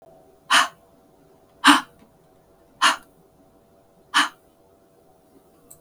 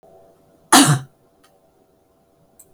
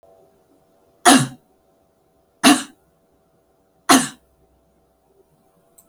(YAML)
exhalation_length: 5.8 s
exhalation_amplitude: 32768
exhalation_signal_mean_std_ratio: 0.26
cough_length: 2.7 s
cough_amplitude: 32768
cough_signal_mean_std_ratio: 0.26
three_cough_length: 5.9 s
three_cough_amplitude: 32768
three_cough_signal_mean_std_ratio: 0.24
survey_phase: beta (2021-08-13 to 2022-03-07)
age: 65+
gender: Female
wearing_mask: 'No'
symptom_none: true
smoker_status: Never smoked
respiratory_condition_asthma: false
respiratory_condition_other: false
recruitment_source: REACT
submission_delay: 4 days
covid_test_result: Negative
covid_test_method: RT-qPCR
influenza_a_test_result: Negative
influenza_b_test_result: Negative